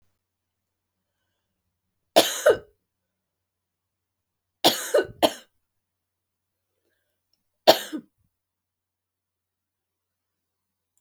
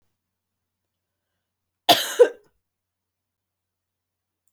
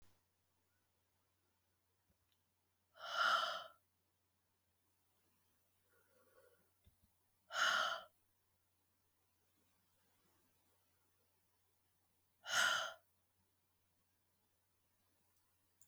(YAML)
three_cough_length: 11.0 s
three_cough_amplitude: 32728
three_cough_signal_mean_std_ratio: 0.19
cough_length: 4.5 s
cough_amplitude: 26876
cough_signal_mean_std_ratio: 0.17
exhalation_length: 15.9 s
exhalation_amplitude: 2219
exhalation_signal_mean_std_ratio: 0.25
survey_phase: beta (2021-08-13 to 2022-03-07)
age: 45-64
gender: Female
wearing_mask: 'No'
symptom_cough_any: true
symptom_runny_or_blocked_nose: true
symptom_fatigue: true
smoker_status: Never smoked
respiratory_condition_asthma: false
respiratory_condition_other: false
recruitment_source: Test and Trace
submission_delay: 1 day
covid_test_result: Positive
covid_test_method: RT-qPCR
covid_ct_value: 11.8
covid_ct_gene: ORF1ab gene
covid_ct_mean: 12.0
covid_viral_load: 120000000 copies/ml
covid_viral_load_category: High viral load (>1M copies/ml)